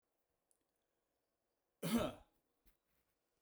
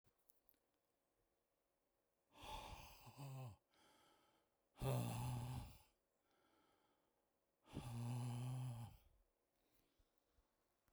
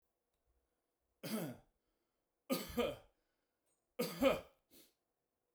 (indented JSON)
{
  "cough_length": "3.4 s",
  "cough_amplitude": 1634,
  "cough_signal_mean_std_ratio": 0.24,
  "exhalation_length": "10.9 s",
  "exhalation_amplitude": 912,
  "exhalation_signal_mean_std_ratio": 0.47,
  "three_cough_length": "5.5 s",
  "three_cough_amplitude": 2941,
  "three_cough_signal_mean_std_ratio": 0.32,
  "survey_phase": "beta (2021-08-13 to 2022-03-07)",
  "age": "45-64",
  "gender": "Male",
  "wearing_mask": "No",
  "symptom_none": true,
  "smoker_status": "Never smoked",
  "respiratory_condition_asthma": false,
  "respiratory_condition_other": false,
  "recruitment_source": "REACT",
  "submission_delay": "3 days",
  "covid_test_result": "Negative",
  "covid_test_method": "RT-qPCR"
}